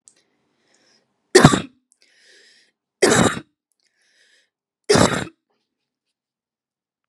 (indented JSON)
{
  "three_cough_length": "7.1 s",
  "three_cough_amplitude": 32768,
  "three_cough_signal_mean_std_ratio": 0.26,
  "survey_phase": "beta (2021-08-13 to 2022-03-07)",
  "age": "18-44",
  "gender": "Female",
  "wearing_mask": "No",
  "symptom_fatigue": true,
  "smoker_status": "Never smoked",
  "respiratory_condition_asthma": false,
  "respiratory_condition_other": false,
  "recruitment_source": "REACT",
  "submission_delay": "3 days",
  "covid_test_result": "Negative",
  "covid_test_method": "RT-qPCR",
  "influenza_a_test_result": "Negative",
  "influenza_b_test_result": "Negative"
}